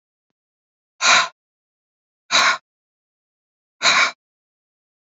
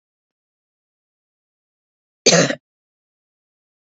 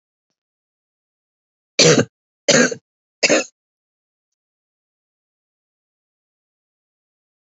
exhalation_length: 5.0 s
exhalation_amplitude: 27605
exhalation_signal_mean_std_ratio: 0.31
cough_length: 3.9 s
cough_amplitude: 30873
cough_signal_mean_std_ratio: 0.19
three_cough_length: 7.5 s
three_cough_amplitude: 32183
three_cough_signal_mean_std_ratio: 0.23
survey_phase: beta (2021-08-13 to 2022-03-07)
age: 45-64
gender: Female
wearing_mask: 'No'
symptom_none: true
smoker_status: Current smoker (1 to 10 cigarettes per day)
respiratory_condition_asthma: false
respiratory_condition_other: false
recruitment_source: REACT
submission_delay: 1 day
covid_test_result: Negative
covid_test_method: RT-qPCR
influenza_a_test_result: Negative
influenza_b_test_result: Negative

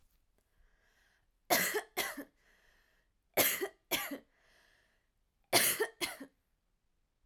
three_cough_length: 7.3 s
three_cough_amplitude: 7087
three_cough_signal_mean_std_ratio: 0.34
survey_phase: alpha (2021-03-01 to 2021-08-12)
age: 18-44
gender: Female
wearing_mask: 'No'
symptom_headache: true
smoker_status: Ex-smoker
respiratory_condition_asthma: false
respiratory_condition_other: false
recruitment_source: REACT
submission_delay: 2 days
covid_test_result: Negative
covid_test_method: RT-qPCR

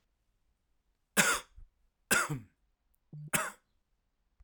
cough_length: 4.4 s
cough_amplitude: 9734
cough_signal_mean_std_ratio: 0.31
survey_phase: alpha (2021-03-01 to 2021-08-12)
age: 45-64
gender: Male
wearing_mask: 'No'
symptom_fatigue: true
symptom_fever_high_temperature: true
symptom_headache: true
symptom_onset: 3 days
smoker_status: Never smoked
respiratory_condition_asthma: false
respiratory_condition_other: false
recruitment_source: Test and Trace
submission_delay: 0 days
covid_test_result: Positive
covid_test_method: RT-qPCR
covid_ct_value: 29.7
covid_ct_gene: ORF1ab gene
covid_ct_mean: 30.3
covid_viral_load: 110 copies/ml
covid_viral_load_category: Minimal viral load (< 10K copies/ml)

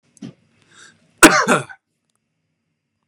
cough_length: 3.1 s
cough_amplitude: 32768
cough_signal_mean_std_ratio: 0.25
survey_phase: beta (2021-08-13 to 2022-03-07)
age: 18-44
gender: Male
wearing_mask: 'No'
symptom_none: true
smoker_status: Ex-smoker
respiratory_condition_asthma: false
respiratory_condition_other: false
recruitment_source: REACT
submission_delay: 3 days
covid_test_result: Negative
covid_test_method: RT-qPCR
influenza_a_test_result: Negative
influenza_b_test_result: Negative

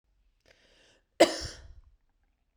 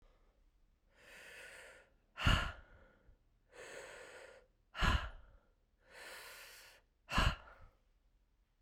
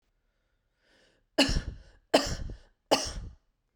cough_length: 2.6 s
cough_amplitude: 14911
cough_signal_mean_std_ratio: 0.19
exhalation_length: 8.6 s
exhalation_amplitude: 4482
exhalation_signal_mean_std_ratio: 0.32
three_cough_length: 3.8 s
three_cough_amplitude: 14302
three_cough_signal_mean_std_ratio: 0.34
survey_phase: beta (2021-08-13 to 2022-03-07)
age: 45-64
gender: Female
wearing_mask: 'No'
symptom_cough_any: true
symptom_runny_or_blocked_nose: true
symptom_sore_throat: true
symptom_diarrhoea: true
symptom_fatigue: true
symptom_fever_high_temperature: true
symptom_headache: true
smoker_status: Never smoked
respiratory_condition_asthma: false
respiratory_condition_other: false
recruitment_source: Test and Trace
submission_delay: 1 day
covid_test_result: Positive
covid_test_method: RT-qPCR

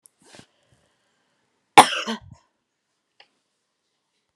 cough_length: 4.4 s
cough_amplitude: 32768
cough_signal_mean_std_ratio: 0.14
survey_phase: alpha (2021-03-01 to 2021-08-12)
age: 45-64
gender: Female
wearing_mask: 'No'
symptom_fatigue: true
symptom_onset: 11 days
smoker_status: Never smoked
respiratory_condition_asthma: false
respiratory_condition_other: false
recruitment_source: REACT
submission_delay: 2 days
covid_test_result: Negative
covid_test_method: RT-qPCR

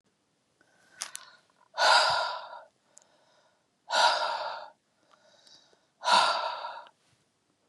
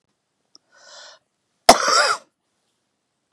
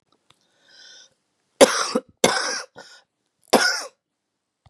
exhalation_length: 7.7 s
exhalation_amplitude: 12172
exhalation_signal_mean_std_ratio: 0.39
cough_length: 3.3 s
cough_amplitude: 32768
cough_signal_mean_std_ratio: 0.25
three_cough_length: 4.7 s
three_cough_amplitude: 32768
three_cough_signal_mean_std_ratio: 0.3
survey_phase: beta (2021-08-13 to 2022-03-07)
age: 45-64
gender: Female
wearing_mask: 'No'
symptom_new_continuous_cough: true
symptom_runny_or_blocked_nose: true
symptom_fatigue: true
smoker_status: Never smoked
respiratory_condition_asthma: false
respiratory_condition_other: false
recruitment_source: Test and Trace
submission_delay: 2 days
covid_test_result: Positive
covid_test_method: RT-qPCR
covid_ct_value: 25.3
covid_ct_gene: ORF1ab gene
covid_ct_mean: 26.0
covid_viral_load: 3000 copies/ml
covid_viral_load_category: Minimal viral load (< 10K copies/ml)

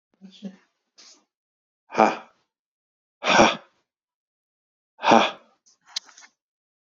exhalation_length: 7.0 s
exhalation_amplitude: 29624
exhalation_signal_mean_std_ratio: 0.25
survey_phase: beta (2021-08-13 to 2022-03-07)
age: 45-64
gender: Male
wearing_mask: 'No'
symptom_none: true
smoker_status: Never smoked
respiratory_condition_asthma: false
respiratory_condition_other: false
recruitment_source: REACT
submission_delay: 2 days
covid_test_result: Negative
covid_test_method: RT-qPCR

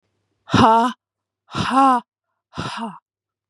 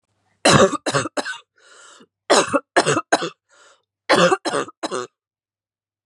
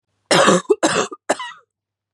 exhalation_length: 3.5 s
exhalation_amplitude: 31572
exhalation_signal_mean_std_ratio: 0.43
three_cough_length: 6.1 s
three_cough_amplitude: 32068
three_cough_signal_mean_std_ratio: 0.41
cough_length: 2.1 s
cough_amplitude: 32252
cough_signal_mean_std_ratio: 0.46
survey_phase: beta (2021-08-13 to 2022-03-07)
age: 18-44
gender: Female
wearing_mask: 'No'
symptom_cough_any: true
symptom_runny_or_blocked_nose: true
symptom_sore_throat: true
symptom_fatigue: true
symptom_headache: true
symptom_onset: 4 days
smoker_status: Never smoked
respiratory_condition_asthma: false
respiratory_condition_other: false
recruitment_source: REACT
submission_delay: 1 day
covid_test_result: Negative
covid_test_method: RT-qPCR
influenza_a_test_result: Negative
influenza_b_test_result: Negative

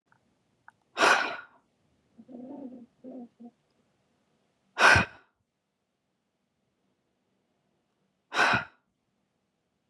exhalation_length: 9.9 s
exhalation_amplitude: 18649
exhalation_signal_mean_std_ratio: 0.25
survey_phase: beta (2021-08-13 to 2022-03-07)
age: 45-64
gender: Female
wearing_mask: 'No'
symptom_none: true
smoker_status: Never smoked
respiratory_condition_asthma: false
respiratory_condition_other: false
recruitment_source: REACT
submission_delay: 2 days
covid_test_result: Negative
covid_test_method: RT-qPCR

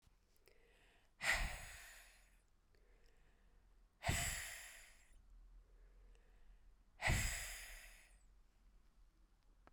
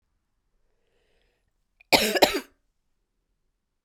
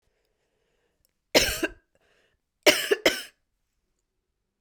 exhalation_length: 9.7 s
exhalation_amplitude: 2162
exhalation_signal_mean_std_ratio: 0.4
cough_length: 3.8 s
cough_amplitude: 31224
cough_signal_mean_std_ratio: 0.23
three_cough_length: 4.6 s
three_cough_amplitude: 23695
three_cough_signal_mean_std_ratio: 0.26
survey_phase: beta (2021-08-13 to 2022-03-07)
age: 45-64
gender: Female
wearing_mask: 'No'
symptom_new_continuous_cough: true
symptom_sore_throat: true
symptom_abdominal_pain: true
symptom_diarrhoea: true
symptom_fatigue: true
symptom_headache: true
symptom_change_to_sense_of_smell_or_taste: true
symptom_loss_of_taste: true
symptom_onset: 5 days
smoker_status: Never smoked
respiratory_condition_asthma: false
respiratory_condition_other: false
recruitment_source: Test and Trace
submission_delay: 1 day
covid_test_result: Positive
covid_test_method: RT-qPCR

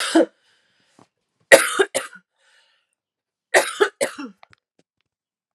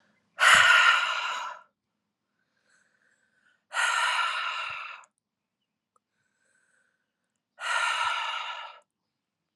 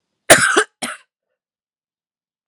three_cough_length: 5.5 s
three_cough_amplitude: 32768
three_cough_signal_mean_std_ratio: 0.28
exhalation_length: 9.6 s
exhalation_amplitude: 20216
exhalation_signal_mean_std_ratio: 0.41
cough_length: 2.5 s
cough_amplitude: 32768
cough_signal_mean_std_ratio: 0.28
survey_phase: alpha (2021-03-01 to 2021-08-12)
age: 18-44
gender: Female
wearing_mask: 'No'
symptom_none: true
smoker_status: Ex-smoker
respiratory_condition_asthma: true
respiratory_condition_other: false
recruitment_source: Test and Trace
submission_delay: 2 days
covid_test_result: Positive
covid_test_method: RT-qPCR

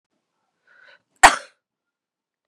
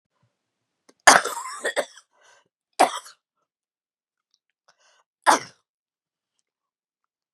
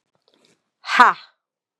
cough_length: 2.5 s
cough_amplitude: 32768
cough_signal_mean_std_ratio: 0.15
three_cough_length: 7.3 s
three_cough_amplitude: 32768
three_cough_signal_mean_std_ratio: 0.2
exhalation_length: 1.8 s
exhalation_amplitude: 32768
exhalation_signal_mean_std_ratio: 0.25
survey_phase: beta (2021-08-13 to 2022-03-07)
age: 45-64
gender: Female
wearing_mask: 'No'
symptom_cough_any: true
symptom_runny_or_blocked_nose: true
symptom_shortness_of_breath: true
symptom_onset: 2 days
smoker_status: Ex-smoker
respiratory_condition_asthma: false
respiratory_condition_other: false
recruitment_source: Test and Trace
submission_delay: 2 days
covid_test_result: Positive
covid_test_method: RT-qPCR
covid_ct_value: 20.2
covid_ct_gene: ORF1ab gene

